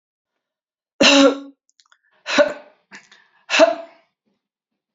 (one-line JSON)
{"three_cough_length": "4.9 s", "three_cough_amplitude": 32767, "three_cough_signal_mean_std_ratio": 0.32, "survey_phase": "beta (2021-08-13 to 2022-03-07)", "age": "65+", "gender": "Female", "wearing_mask": "No", "symptom_sore_throat": true, "symptom_onset": "6 days", "smoker_status": "Never smoked", "respiratory_condition_asthma": false, "respiratory_condition_other": false, "recruitment_source": "REACT", "submission_delay": "3 days", "covid_test_result": "Negative", "covid_test_method": "RT-qPCR"}